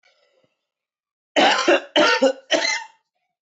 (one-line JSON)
{"three_cough_length": "3.4 s", "three_cough_amplitude": 19456, "three_cough_signal_mean_std_ratio": 0.46, "survey_phase": "beta (2021-08-13 to 2022-03-07)", "age": "18-44", "gender": "Male", "wearing_mask": "No", "symptom_cough_any": true, "symptom_diarrhoea": true, "symptom_fatigue": true, "symptom_headache": true, "smoker_status": "Never smoked", "respiratory_condition_asthma": false, "respiratory_condition_other": false, "recruitment_source": "Test and Trace", "submission_delay": "2 days", "covid_test_result": "Positive", "covid_test_method": "ePCR"}